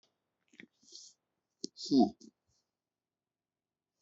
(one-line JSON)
{"exhalation_length": "4.0 s", "exhalation_amplitude": 5874, "exhalation_signal_mean_std_ratio": 0.2, "survey_phase": "beta (2021-08-13 to 2022-03-07)", "age": "45-64", "gender": "Male", "wearing_mask": "No", "symptom_none": true, "smoker_status": "Never smoked", "respiratory_condition_asthma": false, "respiratory_condition_other": false, "recruitment_source": "REACT", "submission_delay": "1 day", "covid_test_result": "Negative", "covid_test_method": "RT-qPCR", "influenza_a_test_result": "Negative", "influenza_b_test_result": "Negative"}